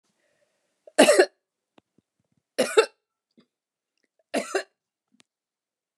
{
  "three_cough_length": "6.0 s",
  "three_cough_amplitude": 25828,
  "three_cough_signal_mean_std_ratio": 0.23,
  "survey_phase": "beta (2021-08-13 to 2022-03-07)",
  "age": "65+",
  "gender": "Female",
  "wearing_mask": "No",
  "symptom_none": true,
  "smoker_status": "Never smoked",
  "respiratory_condition_asthma": false,
  "respiratory_condition_other": false,
  "recruitment_source": "REACT",
  "submission_delay": "1 day",
  "covid_test_result": "Negative",
  "covid_test_method": "RT-qPCR"
}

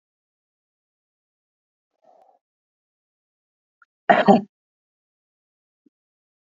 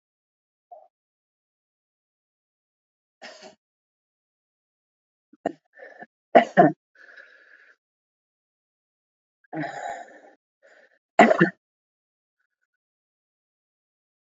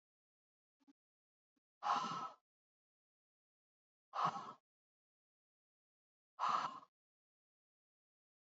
{
  "cough_length": "6.6 s",
  "cough_amplitude": 31538,
  "cough_signal_mean_std_ratio": 0.15,
  "three_cough_length": "14.3 s",
  "three_cough_amplitude": 28252,
  "three_cough_signal_mean_std_ratio": 0.17,
  "exhalation_length": "8.4 s",
  "exhalation_amplitude": 2083,
  "exhalation_signal_mean_std_ratio": 0.28,
  "survey_phase": "beta (2021-08-13 to 2022-03-07)",
  "age": "45-64",
  "gender": "Female",
  "wearing_mask": "No",
  "symptom_new_continuous_cough": true,
  "symptom_runny_or_blocked_nose": true,
  "symptom_shortness_of_breath": true,
  "symptom_sore_throat": true,
  "symptom_diarrhoea": true,
  "symptom_fatigue": true,
  "symptom_headache": true,
  "symptom_change_to_sense_of_smell_or_taste": true,
  "symptom_loss_of_taste": true,
  "symptom_onset": "2 days",
  "smoker_status": "Ex-smoker",
  "respiratory_condition_asthma": true,
  "respiratory_condition_other": false,
  "recruitment_source": "Test and Trace",
  "submission_delay": "2 days",
  "covid_test_result": "Positive",
  "covid_test_method": "RT-qPCR",
  "covid_ct_value": 16.7,
  "covid_ct_gene": "ORF1ab gene",
  "covid_ct_mean": 17.2,
  "covid_viral_load": "2400000 copies/ml",
  "covid_viral_load_category": "High viral load (>1M copies/ml)"
}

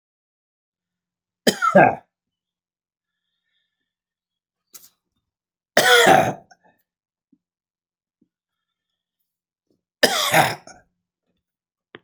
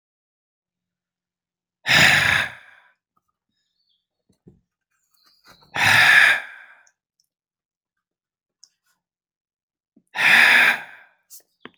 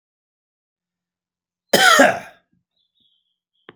{
  "three_cough_length": "12.0 s",
  "three_cough_amplitude": 30514,
  "three_cough_signal_mean_std_ratio": 0.26,
  "exhalation_length": "11.8 s",
  "exhalation_amplitude": 29616,
  "exhalation_signal_mean_std_ratio": 0.32,
  "cough_length": "3.8 s",
  "cough_amplitude": 30718,
  "cough_signal_mean_std_ratio": 0.27,
  "survey_phase": "beta (2021-08-13 to 2022-03-07)",
  "age": "65+",
  "gender": "Male",
  "wearing_mask": "No",
  "symptom_none": true,
  "smoker_status": "Never smoked",
  "respiratory_condition_asthma": false,
  "respiratory_condition_other": false,
  "recruitment_source": "REACT",
  "submission_delay": "2 days",
  "covid_test_result": "Negative",
  "covid_test_method": "RT-qPCR"
}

